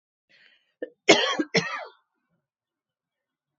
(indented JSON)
{
  "cough_length": "3.6 s",
  "cough_amplitude": 26252,
  "cough_signal_mean_std_ratio": 0.27,
  "survey_phase": "beta (2021-08-13 to 2022-03-07)",
  "age": "45-64",
  "gender": "Female",
  "wearing_mask": "No",
  "symptom_cough_any": true,
  "symptom_onset": "3 days",
  "smoker_status": "Never smoked",
  "respiratory_condition_asthma": false,
  "respiratory_condition_other": false,
  "recruitment_source": "Test and Trace",
  "submission_delay": "2 days",
  "covid_test_result": "Positive",
  "covid_test_method": "ePCR"
}